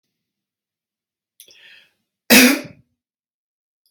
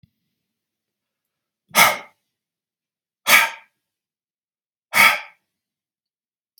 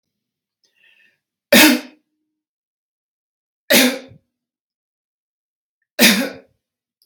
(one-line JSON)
{"cough_length": "3.9 s", "cough_amplitude": 32767, "cough_signal_mean_std_ratio": 0.22, "exhalation_length": "6.6 s", "exhalation_amplitude": 32768, "exhalation_signal_mean_std_ratio": 0.24, "three_cough_length": "7.1 s", "three_cough_amplitude": 32768, "three_cough_signal_mean_std_ratio": 0.27, "survey_phase": "beta (2021-08-13 to 2022-03-07)", "age": "45-64", "gender": "Male", "wearing_mask": "No", "symptom_none": true, "smoker_status": "Never smoked", "respiratory_condition_asthma": false, "respiratory_condition_other": false, "recruitment_source": "Test and Trace", "submission_delay": "-1 day", "covid_test_result": "Negative", "covid_test_method": "LFT"}